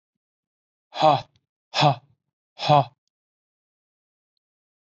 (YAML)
exhalation_length: 4.9 s
exhalation_amplitude: 19446
exhalation_signal_mean_std_ratio: 0.27
survey_phase: alpha (2021-03-01 to 2021-08-12)
age: 18-44
gender: Male
wearing_mask: 'No'
symptom_none: true
smoker_status: Never smoked
respiratory_condition_asthma: false
respiratory_condition_other: false
recruitment_source: Test and Trace
submission_delay: 2 days
covid_test_result: Positive
covid_test_method: RT-qPCR
covid_ct_value: 30.6
covid_ct_gene: ORF1ab gene
covid_ct_mean: 30.9
covid_viral_load: 74 copies/ml
covid_viral_load_category: Minimal viral load (< 10K copies/ml)